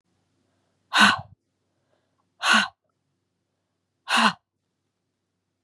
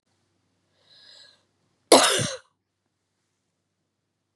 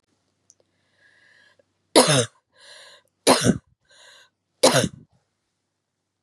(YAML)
exhalation_length: 5.6 s
exhalation_amplitude: 22487
exhalation_signal_mean_std_ratio: 0.27
cough_length: 4.4 s
cough_amplitude: 32767
cough_signal_mean_std_ratio: 0.21
three_cough_length: 6.2 s
three_cough_amplitude: 32618
three_cough_signal_mean_std_ratio: 0.27
survey_phase: beta (2021-08-13 to 2022-03-07)
age: 18-44
gender: Female
wearing_mask: 'No'
symptom_runny_or_blocked_nose: true
symptom_sore_throat: true
symptom_headache: true
symptom_change_to_sense_of_smell_or_taste: true
symptom_onset: 5 days
smoker_status: Never smoked
respiratory_condition_asthma: false
respiratory_condition_other: false
recruitment_source: Test and Trace
submission_delay: 1 day
covid_test_result: Positive
covid_test_method: RT-qPCR
covid_ct_value: 18.8
covid_ct_gene: N gene